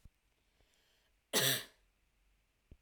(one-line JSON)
{"cough_length": "2.8 s", "cough_amplitude": 4459, "cough_signal_mean_std_ratio": 0.27, "survey_phase": "alpha (2021-03-01 to 2021-08-12)", "age": "18-44", "gender": "Female", "wearing_mask": "No", "symptom_none": true, "smoker_status": "Never smoked", "respiratory_condition_asthma": true, "respiratory_condition_other": false, "recruitment_source": "REACT", "submission_delay": "1 day", "covid_test_result": "Negative", "covid_test_method": "RT-qPCR"}